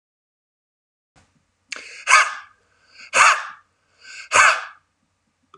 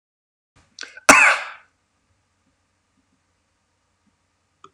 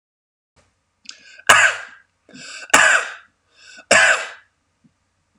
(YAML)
exhalation_length: 5.6 s
exhalation_amplitude: 32768
exhalation_signal_mean_std_ratio: 0.31
cough_length: 4.7 s
cough_amplitude: 32768
cough_signal_mean_std_ratio: 0.2
three_cough_length: 5.4 s
three_cough_amplitude: 32768
three_cough_signal_mean_std_ratio: 0.34
survey_phase: alpha (2021-03-01 to 2021-08-12)
age: 45-64
gender: Male
wearing_mask: 'No'
symptom_none: true
smoker_status: Ex-smoker
respiratory_condition_asthma: false
respiratory_condition_other: false
recruitment_source: REACT
submission_delay: 35 days
covid_test_result: Negative
covid_test_method: RT-qPCR